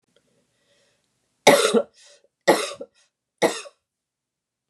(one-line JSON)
{"three_cough_length": "4.7 s", "three_cough_amplitude": 32767, "three_cough_signal_mean_std_ratio": 0.28, "survey_phase": "beta (2021-08-13 to 2022-03-07)", "age": "45-64", "gender": "Female", "wearing_mask": "No", "symptom_cough_any": true, "symptom_runny_or_blocked_nose": true, "symptom_sore_throat": true, "symptom_onset": "9 days", "smoker_status": "Ex-smoker", "respiratory_condition_asthma": false, "respiratory_condition_other": false, "recruitment_source": "REACT", "submission_delay": "0 days", "covid_test_result": "Positive", "covid_test_method": "RT-qPCR", "covid_ct_value": 25.0, "covid_ct_gene": "E gene", "influenza_a_test_result": "Negative", "influenza_b_test_result": "Negative"}